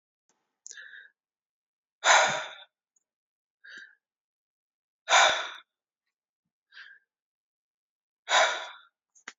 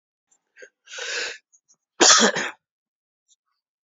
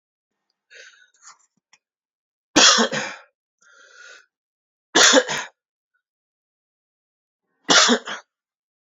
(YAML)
exhalation_length: 9.4 s
exhalation_amplitude: 15473
exhalation_signal_mean_std_ratio: 0.27
cough_length: 3.9 s
cough_amplitude: 30402
cough_signal_mean_std_ratio: 0.3
three_cough_length: 9.0 s
three_cough_amplitude: 32072
three_cough_signal_mean_std_ratio: 0.28
survey_phase: beta (2021-08-13 to 2022-03-07)
age: 18-44
gender: Male
wearing_mask: 'No'
symptom_cough_any: true
symptom_sore_throat: true
symptom_headache: true
symptom_onset: 5 days
smoker_status: Never smoked
respiratory_condition_asthma: true
respiratory_condition_other: false
recruitment_source: REACT
submission_delay: 3 days
covid_test_result: Negative
covid_test_method: RT-qPCR